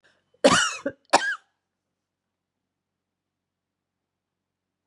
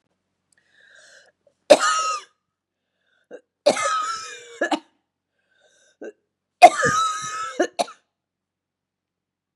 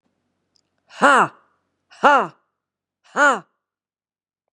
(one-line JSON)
{"cough_length": "4.9 s", "cough_amplitude": 22921, "cough_signal_mean_std_ratio": 0.23, "three_cough_length": "9.6 s", "three_cough_amplitude": 32768, "three_cough_signal_mean_std_ratio": 0.29, "exhalation_length": "4.5 s", "exhalation_amplitude": 32742, "exhalation_signal_mean_std_ratio": 0.28, "survey_phase": "beta (2021-08-13 to 2022-03-07)", "age": "45-64", "gender": "Female", "wearing_mask": "No", "symptom_cough_any": true, "symptom_runny_or_blocked_nose": true, "symptom_sore_throat": true, "symptom_fatigue": true, "symptom_headache": true, "symptom_onset": "4 days", "smoker_status": "Ex-smoker", "respiratory_condition_asthma": false, "respiratory_condition_other": false, "recruitment_source": "Test and Trace", "submission_delay": "2 days", "covid_test_result": "Positive", "covid_test_method": "RT-qPCR", "covid_ct_value": 21.4, "covid_ct_gene": "ORF1ab gene", "covid_ct_mean": 21.6, "covid_viral_load": "82000 copies/ml", "covid_viral_load_category": "Low viral load (10K-1M copies/ml)"}